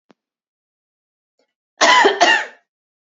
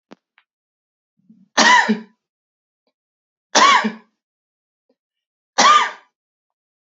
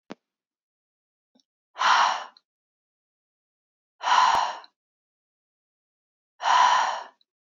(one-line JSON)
{"cough_length": "3.2 s", "cough_amplitude": 31854, "cough_signal_mean_std_ratio": 0.35, "three_cough_length": "7.0 s", "three_cough_amplitude": 30823, "three_cough_signal_mean_std_ratio": 0.31, "exhalation_length": "7.4 s", "exhalation_amplitude": 15229, "exhalation_signal_mean_std_ratio": 0.36, "survey_phase": "beta (2021-08-13 to 2022-03-07)", "age": "18-44", "gender": "Female", "wearing_mask": "No", "symptom_none": true, "smoker_status": "Never smoked", "respiratory_condition_asthma": true, "respiratory_condition_other": false, "recruitment_source": "REACT", "submission_delay": "2 days", "covid_test_result": "Negative", "covid_test_method": "RT-qPCR", "influenza_a_test_result": "Negative", "influenza_b_test_result": "Negative"}